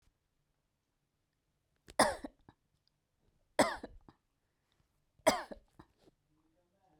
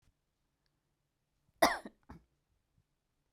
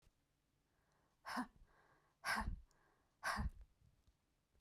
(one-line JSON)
{"three_cough_length": "7.0 s", "three_cough_amplitude": 7922, "three_cough_signal_mean_std_ratio": 0.19, "cough_length": "3.3 s", "cough_amplitude": 8533, "cough_signal_mean_std_ratio": 0.16, "exhalation_length": "4.6 s", "exhalation_amplitude": 1429, "exhalation_signal_mean_std_ratio": 0.37, "survey_phase": "beta (2021-08-13 to 2022-03-07)", "age": "45-64", "gender": "Female", "wearing_mask": "No", "symptom_none": true, "smoker_status": "Never smoked", "respiratory_condition_asthma": false, "respiratory_condition_other": false, "recruitment_source": "REACT", "submission_delay": "1 day", "covid_test_result": "Negative", "covid_test_method": "RT-qPCR"}